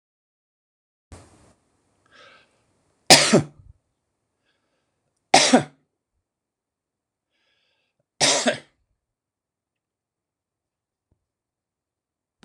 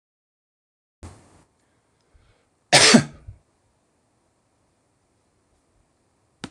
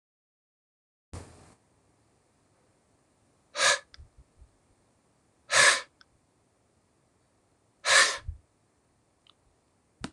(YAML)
three_cough_length: 12.4 s
three_cough_amplitude: 26028
three_cough_signal_mean_std_ratio: 0.19
cough_length: 6.5 s
cough_amplitude: 26028
cough_signal_mean_std_ratio: 0.18
exhalation_length: 10.1 s
exhalation_amplitude: 14585
exhalation_signal_mean_std_ratio: 0.23
survey_phase: alpha (2021-03-01 to 2021-08-12)
age: 65+
gender: Male
wearing_mask: 'No'
symptom_none: true
smoker_status: Never smoked
respiratory_condition_asthma: false
respiratory_condition_other: false
recruitment_source: REACT
submission_delay: 2 days
covid_test_result: Negative
covid_test_method: RT-qPCR